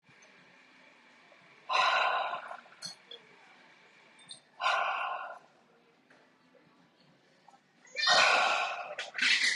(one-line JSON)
{"exhalation_length": "9.6 s", "exhalation_amplitude": 8815, "exhalation_signal_mean_std_ratio": 0.46, "survey_phase": "beta (2021-08-13 to 2022-03-07)", "age": "45-64", "gender": "Female", "wearing_mask": "No", "symptom_none": true, "smoker_status": "Current smoker (1 to 10 cigarettes per day)", "respiratory_condition_asthma": false, "respiratory_condition_other": false, "recruitment_source": "REACT", "submission_delay": "1 day", "covid_test_result": "Negative", "covid_test_method": "RT-qPCR", "influenza_a_test_result": "Negative", "influenza_b_test_result": "Negative"}